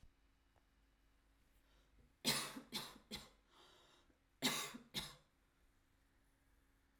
{"three_cough_length": "7.0 s", "three_cough_amplitude": 2041, "three_cough_signal_mean_std_ratio": 0.33, "survey_phase": "alpha (2021-03-01 to 2021-08-12)", "age": "18-44", "gender": "Female", "wearing_mask": "No", "symptom_none": true, "smoker_status": "Current smoker (e-cigarettes or vapes only)", "respiratory_condition_asthma": false, "respiratory_condition_other": false, "recruitment_source": "REACT", "submission_delay": "0 days", "covid_test_result": "Negative", "covid_test_method": "RT-qPCR"}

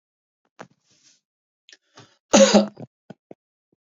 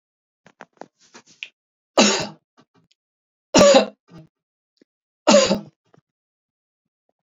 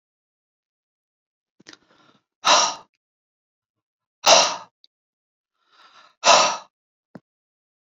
{"cough_length": "3.9 s", "cough_amplitude": 29356, "cough_signal_mean_std_ratio": 0.23, "three_cough_length": "7.3 s", "three_cough_amplitude": 28680, "three_cough_signal_mean_std_ratio": 0.28, "exhalation_length": "7.9 s", "exhalation_amplitude": 31754, "exhalation_signal_mean_std_ratio": 0.25, "survey_phase": "beta (2021-08-13 to 2022-03-07)", "age": "45-64", "gender": "Male", "wearing_mask": "No", "symptom_none": true, "smoker_status": "Ex-smoker", "respiratory_condition_asthma": false, "respiratory_condition_other": false, "recruitment_source": "REACT", "submission_delay": "2 days", "covid_test_result": "Negative", "covid_test_method": "RT-qPCR"}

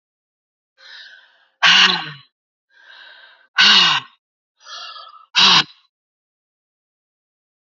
{"exhalation_length": "7.8 s", "exhalation_amplitude": 32767, "exhalation_signal_mean_std_ratio": 0.32, "survey_phase": "beta (2021-08-13 to 2022-03-07)", "age": "45-64", "gender": "Female", "wearing_mask": "No", "symptom_cough_any": true, "symptom_runny_or_blocked_nose": true, "symptom_sore_throat": true, "symptom_fatigue": true, "symptom_fever_high_temperature": true, "symptom_headache": true, "symptom_change_to_sense_of_smell_or_taste": true, "symptom_loss_of_taste": true, "symptom_onset": "6 days", "smoker_status": "Never smoked", "respiratory_condition_asthma": false, "respiratory_condition_other": false, "recruitment_source": "Test and Trace", "submission_delay": "2 days", "covid_test_result": "Positive", "covid_test_method": "RT-qPCR", "covid_ct_value": 16.3, "covid_ct_gene": "ORF1ab gene"}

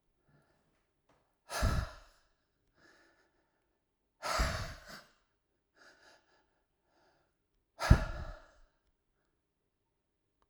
{"exhalation_length": "10.5 s", "exhalation_amplitude": 11613, "exhalation_signal_mean_std_ratio": 0.23, "survey_phase": "alpha (2021-03-01 to 2021-08-12)", "age": "65+", "gender": "Male", "wearing_mask": "No", "symptom_cough_any": true, "symptom_fatigue": true, "symptom_change_to_sense_of_smell_or_taste": true, "symptom_loss_of_taste": true, "symptom_onset": "5 days", "smoker_status": "Ex-smoker", "respiratory_condition_asthma": false, "respiratory_condition_other": false, "recruitment_source": "Test and Trace", "submission_delay": "1 day", "covid_test_result": "Positive", "covid_test_method": "RT-qPCR"}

